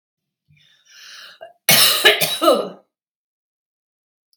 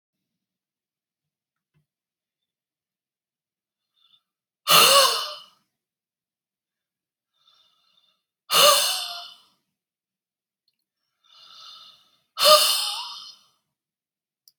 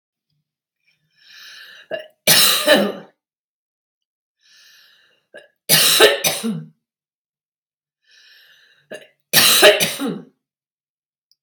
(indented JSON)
{
  "cough_length": "4.4 s",
  "cough_amplitude": 32768,
  "cough_signal_mean_std_ratio": 0.36,
  "exhalation_length": "14.6 s",
  "exhalation_amplitude": 27486,
  "exhalation_signal_mean_std_ratio": 0.26,
  "three_cough_length": "11.4 s",
  "three_cough_amplitude": 32768,
  "three_cough_signal_mean_std_ratio": 0.35,
  "survey_phase": "beta (2021-08-13 to 2022-03-07)",
  "age": "65+",
  "gender": "Female",
  "wearing_mask": "No",
  "symptom_none": true,
  "smoker_status": "Never smoked",
  "respiratory_condition_asthma": true,
  "respiratory_condition_other": false,
  "recruitment_source": "REACT",
  "submission_delay": "1 day",
  "covid_test_result": "Negative",
  "covid_test_method": "RT-qPCR",
  "influenza_a_test_result": "Negative",
  "influenza_b_test_result": "Negative"
}